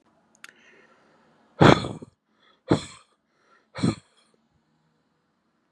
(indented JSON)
{
  "exhalation_length": "5.7 s",
  "exhalation_amplitude": 32768,
  "exhalation_signal_mean_std_ratio": 0.2,
  "survey_phase": "beta (2021-08-13 to 2022-03-07)",
  "age": "18-44",
  "gender": "Male",
  "wearing_mask": "No",
  "symptom_cough_any": true,
  "symptom_headache": true,
  "smoker_status": "Never smoked",
  "respiratory_condition_asthma": false,
  "respiratory_condition_other": false,
  "recruitment_source": "Test and Trace",
  "submission_delay": "2 days",
  "covid_test_result": "Positive",
  "covid_test_method": "RT-qPCR",
  "covid_ct_value": 20.2,
  "covid_ct_gene": "ORF1ab gene",
  "covid_ct_mean": 20.6,
  "covid_viral_load": "180000 copies/ml",
  "covid_viral_load_category": "Low viral load (10K-1M copies/ml)"
}